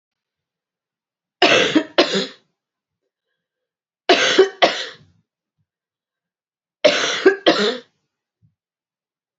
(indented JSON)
{
  "three_cough_length": "9.4 s",
  "three_cough_amplitude": 32767,
  "three_cough_signal_mean_std_ratio": 0.34,
  "survey_phase": "beta (2021-08-13 to 2022-03-07)",
  "age": "45-64",
  "gender": "Female",
  "wearing_mask": "No",
  "symptom_cough_any": true,
  "symptom_fatigue": true,
  "symptom_fever_high_temperature": true,
  "symptom_headache": true,
  "symptom_other": true,
  "smoker_status": "Never smoked",
  "respiratory_condition_asthma": false,
  "respiratory_condition_other": false,
  "recruitment_source": "Test and Trace",
  "submission_delay": "2 days",
  "covid_test_result": "Positive",
  "covid_test_method": "LFT"
}